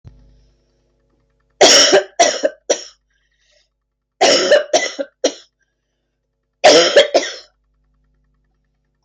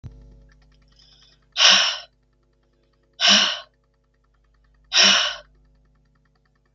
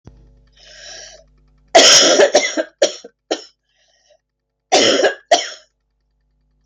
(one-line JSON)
{"three_cough_length": "9.0 s", "three_cough_amplitude": 32768, "three_cough_signal_mean_std_ratio": 0.38, "exhalation_length": "6.7 s", "exhalation_amplitude": 32766, "exhalation_signal_mean_std_ratio": 0.33, "cough_length": "6.7 s", "cough_amplitude": 32768, "cough_signal_mean_std_ratio": 0.39, "survey_phase": "beta (2021-08-13 to 2022-03-07)", "age": "45-64", "gender": "Female", "wearing_mask": "No", "symptom_cough_any": true, "symptom_runny_or_blocked_nose": true, "symptom_sore_throat": true, "symptom_fatigue": true, "symptom_fever_high_temperature": true, "symptom_onset": "2 days", "smoker_status": "Ex-smoker", "respiratory_condition_asthma": false, "respiratory_condition_other": false, "recruitment_source": "Test and Trace", "submission_delay": "1 day", "covid_test_result": "Negative", "covid_test_method": "RT-qPCR"}